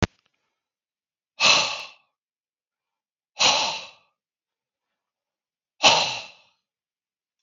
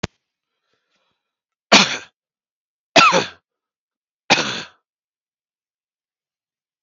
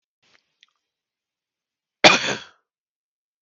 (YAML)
exhalation_length: 7.4 s
exhalation_amplitude: 32766
exhalation_signal_mean_std_ratio: 0.29
three_cough_length: 6.8 s
three_cough_amplitude: 32768
three_cough_signal_mean_std_ratio: 0.24
cough_length: 3.4 s
cough_amplitude: 32768
cough_signal_mean_std_ratio: 0.19
survey_phase: beta (2021-08-13 to 2022-03-07)
age: 18-44
gender: Male
wearing_mask: 'No'
symptom_none: true
smoker_status: Ex-smoker
respiratory_condition_asthma: true
respiratory_condition_other: false
recruitment_source: REACT
submission_delay: 1 day
covid_test_result: Negative
covid_test_method: RT-qPCR